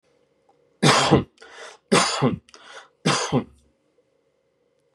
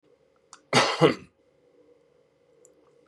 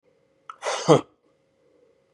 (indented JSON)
{
  "three_cough_length": "4.9 s",
  "three_cough_amplitude": 26052,
  "three_cough_signal_mean_std_ratio": 0.39,
  "cough_length": "3.1 s",
  "cough_amplitude": 22768,
  "cough_signal_mean_std_ratio": 0.27,
  "exhalation_length": "2.1 s",
  "exhalation_amplitude": 28863,
  "exhalation_signal_mean_std_ratio": 0.25,
  "survey_phase": "beta (2021-08-13 to 2022-03-07)",
  "age": "45-64",
  "gender": "Male",
  "wearing_mask": "No",
  "symptom_none": true,
  "smoker_status": "Ex-smoker",
  "respiratory_condition_asthma": false,
  "respiratory_condition_other": true,
  "recruitment_source": "REACT",
  "submission_delay": "1 day",
  "covid_test_result": "Negative",
  "covid_test_method": "RT-qPCR",
  "covid_ct_value": 40.0,
  "covid_ct_gene": "N gene",
  "influenza_a_test_result": "Positive",
  "influenza_a_ct_value": 33.9,
  "influenza_b_test_result": "Positive",
  "influenza_b_ct_value": 35.6
}